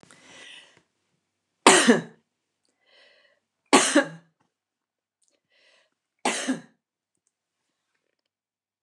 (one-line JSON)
{"three_cough_length": "8.8 s", "three_cough_amplitude": 29203, "three_cough_signal_mean_std_ratio": 0.23, "survey_phase": "beta (2021-08-13 to 2022-03-07)", "age": "65+", "gender": "Female", "wearing_mask": "No", "symptom_none": true, "smoker_status": "Ex-smoker", "respiratory_condition_asthma": false, "respiratory_condition_other": false, "recruitment_source": "REACT", "submission_delay": "1 day", "covid_test_result": "Negative", "covid_test_method": "RT-qPCR"}